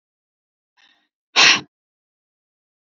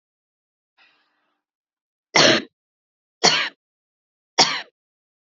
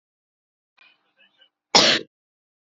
{
  "exhalation_length": "2.9 s",
  "exhalation_amplitude": 31965,
  "exhalation_signal_mean_std_ratio": 0.22,
  "three_cough_length": "5.2 s",
  "three_cough_amplitude": 32768,
  "three_cough_signal_mean_std_ratio": 0.27,
  "cough_length": "2.6 s",
  "cough_amplitude": 29355,
  "cough_signal_mean_std_ratio": 0.24,
  "survey_phase": "beta (2021-08-13 to 2022-03-07)",
  "age": "18-44",
  "gender": "Female",
  "wearing_mask": "No",
  "symptom_other": true,
  "smoker_status": "Ex-smoker",
  "respiratory_condition_asthma": false,
  "respiratory_condition_other": false,
  "recruitment_source": "REACT",
  "submission_delay": "3 days",
  "covid_test_result": "Negative",
  "covid_test_method": "RT-qPCR",
  "influenza_a_test_result": "Negative",
  "influenza_b_test_result": "Negative"
}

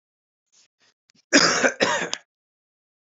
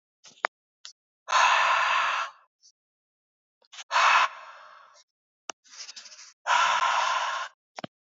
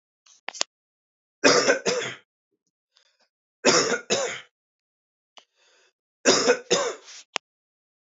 {
  "cough_length": "3.1 s",
  "cough_amplitude": 27367,
  "cough_signal_mean_std_ratio": 0.35,
  "exhalation_length": "8.2 s",
  "exhalation_amplitude": 22255,
  "exhalation_signal_mean_std_ratio": 0.46,
  "three_cough_length": "8.0 s",
  "three_cough_amplitude": 23054,
  "three_cough_signal_mean_std_ratio": 0.36,
  "survey_phase": "beta (2021-08-13 to 2022-03-07)",
  "age": "18-44",
  "gender": "Male",
  "wearing_mask": "No",
  "symptom_cough_any": true,
  "symptom_runny_or_blocked_nose": true,
  "symptom_fatigue": true,
  "smoker_status": "Ex-smoker",
  "respiratory_condition_asthma": false,
  "respiratory_condition_other": false,
  "recruitment_source": "Test and Trace",
  "submission_delay": "2 days",
  "covid_test_result": "Positive",
  "covid_test_method": "ePCR"
}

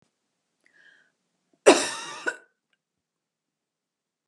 {
  "cough_length": "4.3 s",
  "cough_amplitude": 28102,
  "cough_signal_mean_std_ratio": 0.19,
  "survey_phase": "beta (2021-08-13 to 2022-03-07)",
  "age": "45-64",
  "gender": "Female",
  "wearing_mask": "No",
  "symptom_runny_or_blocked_nose": true,
  "smoker_status": "Never smoked",
  "respiratory_condition_asthma": false,
  "respiratory_condition_other": false,
  "recruitment_source": "REACT",
  "submission_delay": "1 day",
  "covid_test_result": "Negative",
  "covid_test_method": "RT-qPCR",
  "influenza_a_test_result": "Negative",
  "influenza_b_test_result": "Negative"
}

